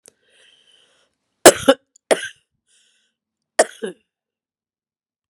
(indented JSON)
{
  "three_cough_length": "5.3 s",
  "three_cough_amplitude": 32768,
  "three_cough_signal_mean_std_ratio": 0.17,
  "survey_phase": "beta (2021-08-13 to 2022-03-07)",
  "age": "45-64",
  "gender": "Female",
  "wearing_mask": "No",
  "symptom_cough_any": true,
  "symptom_runny_or_blocked_nose": true,
  "symptom_sore_throat": true,
  "symptom_headache": true,
  "symptom_loss_of_taste": true,
  "symptom_other": true,
  "symptom_onset": "4 days",
  "smoker_status": "Ex-smoker",
  "respiratory_condition_asthma": false,
  "respiratory_condition_other": false,
  "recruitment_source": "Test and Trace",
  "submission_delay": "1 day",
  "covid_test_result": "Positive",
  "covid_test_method": "RT-qPCR",
  "covid_ct_value": 29.5,
  "covid_ct_gene": "N gene"
}